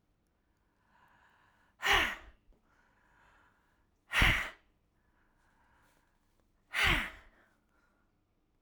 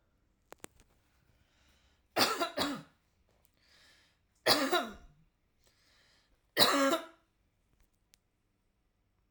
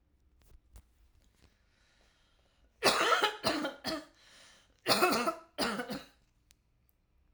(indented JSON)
{
  "exhalation_length": "8.6 s",
  "exhalation_amplitude": 7861,
  "exhalation_signal_mean_std_ratio": 0.28,
  "three_cough_length": "9.3 s",
  "three_cough_amplitude": 11481,
  "three_cough_signal_mean_std_ratio": 0.3,
  "cough_length": "7.3 s",
  "cough_amplitude": 10128,
  "cough_signal_mean_std_ratio": 0.39,
  "survey_phase": "alpha (2021-03-01 to 2021-08-12)",
  "age": "45-64",
  "gender": "Female",
  "wearing_mask": "No",
  "symptom_none": true,
  "smoker_status": "Ex-smoker",
  "respiratory_condition_asthma": false,
  "respiratory_condition_other": false,
  "recruitment_source": "REACT",
  "submission_delay": "2 days",
  "covid_test_result": "Negative",
  "covid_test_method": "RT-qPCR"
}